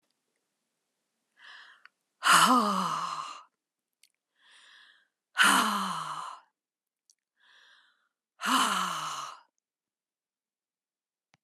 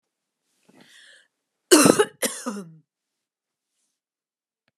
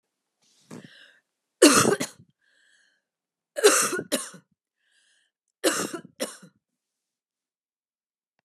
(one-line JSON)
{"exhalation_length": "11.4 s", "exhalation_amplitude": 14418, "exhalation_signal_mean_std_ratio": 0.35, "cough_length": "4.8 s", "cough_amplitude": 32768, "cough_signal_mean_std_ratio": 0.23, "three_cough_length": "8.4 s", "three_cough_amplitude": 25229, "three_cough_signal_mean_std_ratio": 0.27, "survey_phase": "beta (2021-08-13 to 2022-03-07)", "age": "45-64", "gender": "Female", "wearing_mask": "No", "symptom_none": true, "smoker_status": "Never smoked", "respiratory_condition_asthma": false, "respiratory_condition_other": false, "recruitment_source": "Test and Trace", "submission_delay": "2 days", "covid_test_result": "Negative", "covid_test_method": "RT-qPCR"}